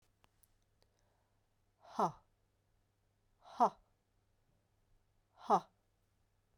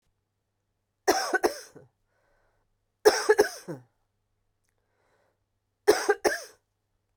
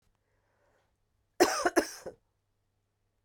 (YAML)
exhalation_length: 6.6 s
exhalation_amplitude: 3842
exhalation_signal_mean_std_ratio: 0.19
three_cough_length: 7.2 s
three_cough_amplitude: 21681
three_cough_signal_mean_std_ratio: 0.28
cough_length: 3.2 s
cough_amplitude: 10842
cough_signal_mean_std_ratio: 0.25
survey_phase: beta (2021-08-13 to 2022-03-07)
age: 45-64
gender: Female
wearing_mask: 'No'
symptom_cough_any: true
symptom_runny_or_blocked_nose: true
symptom_sore_throat: true
symptom_fever_high_temperature: true
symptom_headache: true
symptom_change_to_sense_of_smell_or_taste: true
symptom_onset: 4 days
smoker_status: Never smoked
respiratory_condition_asthma: false
respiratory_condition_other: false
recruitment_source: Test and Trace
submission_delay: 2 days
covid_test_result: Positive
covid_test_method: ePCR